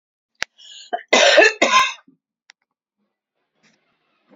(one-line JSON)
{"cough_length": "4.4 s", "cough_amplitude": 31042, "cough_signal_mean_std_ratio": 0.33, "survey_phase": "beta (2021-08-13 to 2022-03-07)", "age": "65+", "gender": "Female", "wearing_mask": "No", "symptom_cough_any": true, "symptom_runny_or_blocked_nose": true, "smoker_status": "Ex-smoker", "respiratory_condition_asthma": false, "respiratory_condition_other": false, "recruitment_source": "Test and Trace", "submission_delay": "1 day", "covid_test_result": "Positive", "covid_test_method": "RT-qPCR", "covid_ct_value": 16.8, "covid_ct_gene": "ORF1ab gene", "covid_ct_mean": 17.0, "covid_viral_load": "2600000 copies/ml", "covid_viral_load_category": "High viral load (>1M copies/ml)"}